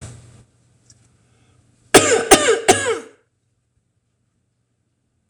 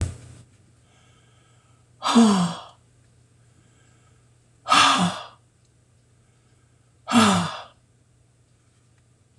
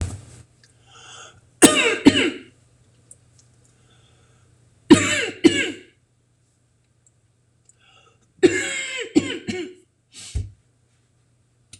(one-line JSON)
{"cough_length": "5.3 s", "cough_amplitude": 26028, "cough_signal_mean_std_ratio": 0.3, "exhalation_length": "9.4 s", "exhalation_amplitude": 24187, "exhalation_signal_mean_std_ratio": 0.33, "three_cough_length": "11.8 s", "three_cough_amplitude": 26028, "three_cough_signal_mean_std_ratio": 0.3, "survey_phase": "beta (2021-08-13 to 2022-03-07)", "age": "45-64", "gender": "Female", "wearing_mask": "No", "symptom_none": true, "smoker_status": "Ex-smoker", "respiratory_condition_asthma": false, "respiratory_condition_other": true, "recruitment_source": "REACT", "submission_delay": "2 days", "covid_test_result": "Negative", "covid_test_method": "RT-qPCR", "influenza_a_test_result": "Negative", "influenza_b_test_result": "Negative"}